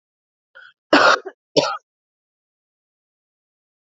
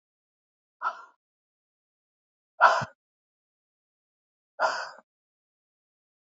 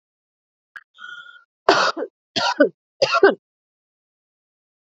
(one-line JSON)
{"cough_length": "3.8 s", "cough_amplitude": 32619, "cough_signal_mean_std_ratio": 0.26, "exhalation_length": "6.3 s", "exhalation_amplitude": 19907, "exhalation_signal_mean_std_ratio": 0.2, "three_cough_length": "4.9 s", "three_cough_amplitude": 28518, "three_cough_signal_mean_std_ratio": 0.32, "survey_phase": "beta (2021-08-13 to 2022-03-07)", "age": "45-64", "gender": "Female", "wearing_mask": "No", "symptom_cough_any": true, "symptom_runny_or_blocked_nose": true, "symptom_shortness_of_breath": true, "symptom_sore_throat": true, "symptom_fatigue": true, "symptom_headache": true, "symptom_onset": "5 days", "smoker_status": "Never smoked", "respiratory_condition_asthma": false, "respiratory_condition_other": false, "recruitment_source": "Test and Trace", "submission_delay": "2 days", "covid_test_result": "Positive", "covid_test_method": "ePCR"}